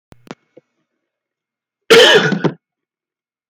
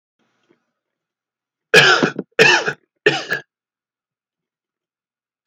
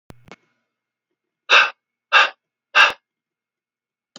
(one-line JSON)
{"cough_length": "3.5 s", "cough_amplitude": 32243, "cough_signal_mean_std_ratio": 0.32, "three_cough_length": "5.5 s", "three_cough_amplitude": 32375, "three_cough_signal_mean_std_ratio": 0.31, "exhalation_length": "4.2 s", "exhalation_amplitude": 30805, "exhalation_signal_mean_std_ratio": 0.27, "survey_phase": "alpha (2021-03-01 to 2021-08-12)", "age": "18-44", "gender": "Male", "wearing_mask": "No", "symptom_cough_any": true, "symptom_fatigue": true, "symptom_fever_high_temperature": true, "symptom_headache": true, "smoker_status": "Never smoked", "respiratory_condition_asthma": false, "respiratory_condition_other": false, "recruitment_source": "Test and Trace", "submission_delay": "1 day", "covid_test_result": "Positive", "covid_test_method": "RT-qPCR"}